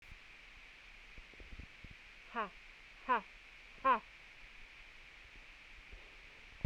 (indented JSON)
{
  "exhalation_length": "6.7 s",
  "exhalation_amplitude": 3414,
  "exhalation_signal_mean_std_ratio": 0.38,
  "survey_phase": "beta (2021-08-13 to 2022-03-07)",
  "age": "45-64",
  "gender": "Female",
  "wearing_mask": "No",
  "symptom_none": true,
  "smoker_status": "Never smoked",
  "respiratory_condition_asthma": false,
  "respiratory_condition_other": false,
  "recruitment_source": "REACT",
  "submission_delay": "2 days",
  "covid_test_result": "Negative",
  "covid_test_method": "RT-qPCR"
}